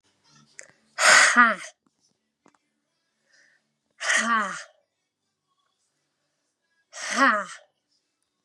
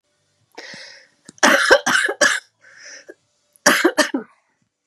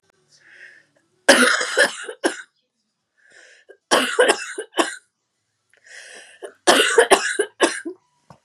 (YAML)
exhalation_length: 8.4 s
exhalation_amplitude: 26070
exhalation_signal_mean_std_ratio: 0.31
cough_length: 4.9 s
cough_amplitude: 32768
cough_signal_mean_std_ratio: 0.4
three_cough_length: 8.4 s
three_cough_amplitude: 32768
three_cough_signal_mean_std_ratio: 0.39
survey_phase: beta (2021-08-13 to 2022-03-07)
age: 45-64
gender: Female
wearing_mask: 'No'
symptom_cough_any: true
symptom_headache: true
smoker_status: Never smoked
respiratory_condition_asthma: true
respiratory_condition_other: false
recruitment_source: REACT
submission_delay: 4 days
covid_test_result: Negative
covid_test_method: RT-qPCR